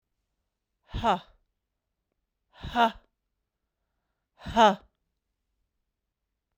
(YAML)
exhalation_length: 6.6 s
exhalation_amplitude: 16312
exhalation_signal_mean_std_ratio: 0.22
survey_phase: beta (2021-08-13 to 2022-03-07)
age: 18-44
gender: Female
wearing_mask: 'No'
symptom_runny_or_blocked_nose: true
symptom_headache: true
symptom_onset: 3 days
smoker_status: Never smoked
respiratory_condition_asthma: false
respiratory_condition_other: false
recruitment_source: Test and Trace
submission_delay: 2 days
covid_test_result: Positive
covid_test_method: RT-qPCR
covid_ct_value: 28.8
covid_ct_gene: N gene
covid_ct_mean: 28.9
covid_viral_load: 340 copies/ml
covid_viral_load_category: Minimal viral load (< 10K copies/ml)